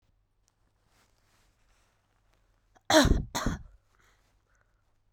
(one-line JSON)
{"cough_length": "5.1 s", "cough_amplitude": 13946, "cough_signal_mean_std_ratio": 0.24, "survey_phase": "beta (2021-08-13 to 2022-03-07)", "age": "18-44", "gender": "Female", "wearing_mask": "No", "symptom_cough_any": true, "symptom_new_continuous_cough": true, "symptom_runny_or_blocked_nose": true, "symptom_sore_throat": true, "symptom_headache": true, "smoker_status": "Ex-smoker", "respiratory_condition_asthma": false, "respiratory_condition_other": false, "recruitment_source": "Test and Trace", "submission_delay": "1 day", "covid_test_result": "Positive", "covid_test_method": "LFT"}